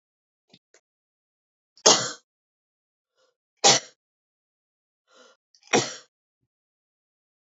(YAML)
three_cough_length: 7.6 s
three_cough_amplitude: 32767
three_cough_signal_mean_std_ratio: 0.19
survey_phase: alpha (2021-03-01 to 2021-08-12)
age: 45-64
gender: Female
wearing_mask: 'No'
symptom_none: true
smoker_status: Never smoked
respiratory_condition_asthma: false
respiratory_condition_other: false
recruitment_source: REACT
submission_delay: 1 day
covid_test_result: Negative
covid_test_method: RT-qPCR